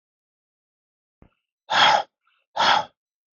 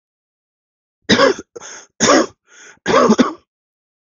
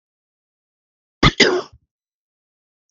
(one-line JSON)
{"exhalation_length": "3.3 s", "exhalation_amplitude": 25095, "exhalation_signal_mean_std_ratio": 0.33, "three_cough_length": "4.0 s", "three_cough_amplitude": 32768, "three_cough_signal_mean_std_ratio": 0.4, "cough_length": "2.9 s", "cough_amplitude": 32768, "cough_signal_mean_std_ratio": 0.24, "survey_phase": "beta (2021-08-13 to 2022-03-07)", "age": "18-44", "gender": "Male", "wearing_mask": "No", "symptom_none": true, "symptom_onset": "13 days", "smoker_status": "Never smoked", "respiratory_condition_asthma": false, "respiratory_condition_other": false, "recruitment_source": "REACT", "submission_delay": "4 days", "covid_test_result": "Negative", "covid_test_method": "RT-qPCR", "influenza_a_test_result": "Negative", "influenza_b_test_result": "Negative"}